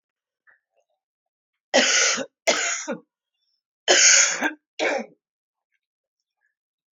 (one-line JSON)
{"three_cough_length": "6.9 s", "three_cough_amplitude": 24890, "three_cough_signal_mean_std_ratio": 0.38, "survey_phase": "beta (2021-08-13 to 2022-03-07)", "age": "45-64", "gender": "Female", "wearing_mask": "No", "symptom_cough_any": true, "symptom_runny_or_blocked_nose": true, "symptom_sore_throat": true, "symptom_abdominal_pain": true, "symptom_diarrhoea": true, "symptom_fatigue": true, "symptom_headache": true, "symptom_change_to_sense_of_smell_or_taste": true, "symptom_onset": "5 days", "smoker_status": "Ex-smoker", "respiratory_condition_asthma": true, "respiratory_condition_other": false, "recruitment_source": "Test and Trace", "submission_delay": "2 days", "covid_test_result": "Positive", "covid_test_method": "LAMP"}